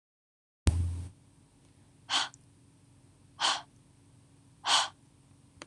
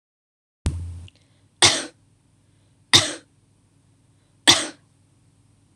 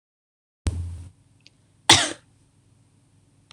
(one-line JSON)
{"exhalation_length": "5.7 s", "exhalation_amplitude": 16927, "exhalation_signal_mean_std_ratio": 0.35, "three_cough_length": "5.8 s", "three_cough_amplitude": 26028, "three_cough_signal_mean_std_ratio": 0.25, "cough_length": "3.5 s", "cough_amplitude": 26028, "cough_signal_mean_std_ratio": 0.24, "survey_phase": "beta (2021-08-13 to 2022-03-07)", "age": "18-44", "gender": "Female", "wearing_mask": "No", "symptom_none": true, "smoker_status": "Never smoked", "respiratory_condition_asthma": false, "respiratory_condition_other": false, "recruitment_source": "REACT", "submission_delay": "1 day", "covid_test_result": "Negative", "covid_test_method": "RT-qPCR", "influenza_a_test_result": "Negative", "influenza_b_test_result": "Negative"}